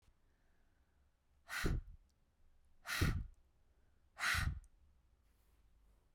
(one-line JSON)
{"exhalation_length": "6.1 s", "exhalation_amplitude": 2879, "exhalation_signal_mean_std_ratio": 0.37, "survey_phase": "beta (2021-08-13 to 2022-03-07)", "age": "18-44", "gender": "Female", "wearing_mask": "No", "symptom_cough_any": true, "symptom_new_continuous_cough": true, "symptom_runny_or_blocked_nose": true, "symptom_sore_throat": true, "symptom_fatigue": true, "symptom_headache": true, "symptom_onset": "2 days", "smoker_status": "Never smoked", "recruitment_source": "Test and Trace", "submission_delay": "1 day", "covid_test_result": "Positive", "covid_test_method": "RT-qPCR", "covid_ct_value": 31.1, "covid_ct_gene": "N gene"}